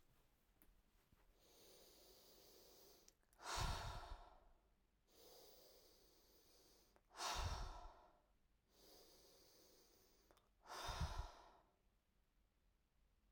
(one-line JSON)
{"exhalation_length": "13.3 s", "exhalation_amplitude": 777, "exhalation_signal_mean_std_ratio": 0.42, "survey_phase": "alpha (2021-03-01 to 2021-08-12)", "age": "18-44", "gender": "Female", "wearing_mask": "No", "symptom_none": true, "smoker_status": "Never smoked", "respiratory_condition_asthma": false, "respiratory_condition_other": false, "recruitment_source": "REACT", "submission_delay": "3 days", "covid_test_result": "Negative", "covid_test_method": "RT-qPCR"}